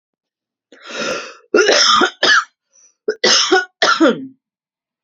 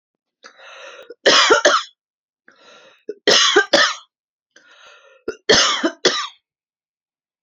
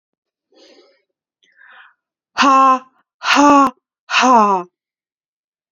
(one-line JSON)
{"cough_length": "5.0 s", "cough_amplitude": 32330, "cough_signal_mean_std_ratio": 0.51, "three_cough_length": "7.4 s", "three_cough_amplitude": 32767, "three_cough_signal_mean_std_ratio": 0.4, "exhalation_length": "5.7 s", "exhalation_amplitude": 29174, "exhalation_signal_mean_std_ratio": 0.41, "survey_phase": "beta (2021-08-13 to 2022-03-07)", "age": "18-44", "gender": "Female", "wearing_mask": "No", "symptom_none": true, "smoker_status": "Never smoked", "respiratory_condition_asthma": false, "respiratory_condition_other": false, "recruitment_source": "REACT", "submission_delay": "3 days", "covid_test_result": "Negative", "covid_test_method": "RT-qPCR", "influenza_a_test_result": "Negative", "influenza_b_test_result": "Negative"}